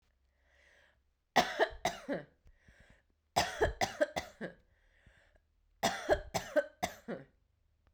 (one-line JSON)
{"three_cough_length": "7.9 s", "three_cough_amplitude": 7392, "three_cough_signal_mean_std_ratio": 0.36, "survey_phase": "beta (2021-08-13 to 2022-03-07)", "age": "45-64", "gender": "Female", "wearing_mask": "No", "symptom_fatigue": true, "symptom_headache": true, "smoker_status": "Never smoked", "respiratory_condition_asthma": false, "respiratory_condition_other": false, "recruitment_source": "Test and Trace", "submission_delay": "1 day", "covid_test_result": "Positive", "covid_test_method": "RT-qPCR"}